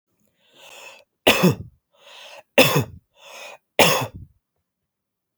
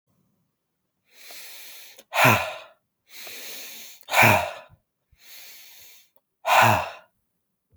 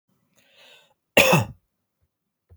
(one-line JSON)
{"three_cough_length": "5.4 s", "three_cough_amplitude": 32767, "three_cough_signal_mean_std_ratio": 0.32, "exhalation_length": "7.8 s", "exhalation_amplitude": 24225, "exhalation_signal_mean_std_ratio": 0.34, "cough_length": "2.6 s", "cough_amplitude": 28857, "cough_signal_mean_std_ratio": 0.27, "survey_phase": "beta (2021-08-13 to 2022-03-07)", "age": "18-44", "gender": "Male", "wearing_mask": "No", "symptom_runny_or_blocked_nose": true, "symptom_onset": "11 days", "smoker_status": "Never smoked", "respiratory_condition_asthma": false, "respiratory_condition_other": false, "recruitment_source": "REACT", "submission_delay": "3 days", "covid_test_result": "Negative", "covid_test_method": "RT-qPCR"}